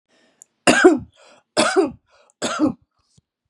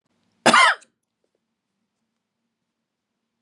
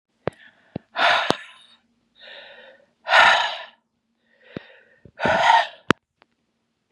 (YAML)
three_cough_length: 3.5 s
three_cough_amplitude: 32767
three_cough_signal_mean_std_ratio: 0.39
cough_length: 3.4 s
cough_amplitude: 29308
cough_signal_mean_std_ratio: 0.23
exhalation_length: 6.9 s
exhalation_amplitude: 32768
exhalation_signal_mean_std_ratio: 0.35
survey_phase: beta (2021-08-13 to 2022-03-07)
age: 45-64
gender: Female
wearing_mask: 'No'
symptom_none: true
smoker_status: Ex-smoker
respiratory_condition_asthma: false
respiratory_condition_other: false
recruitment_source: REACT
submission_delay: 2 days
covid_test_result: Negative
covid_test_method: RT-qPCR
influenza_a_test_result: Negative
influenza_b_test_result: Negative